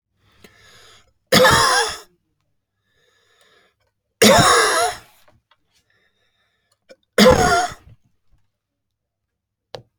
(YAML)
three_cough_length: 10.0 s
three_cough_amplitude: 32335
three_cough_signal_mean_std_ratio: 0.35
survey_phase: beta (2021-08-13 to 2022-03-07)
age: 45-64
gender: Male
wearing_mask: 'No'
symptom_none: true
smoker_status: Never smoked
respiratory_condition_asthma: false
respiratory_condition_other: false
recruitment_source: REACT
submission_delay: 2 days
covid_test_result: Negative
covid_test_method: RT-qPCR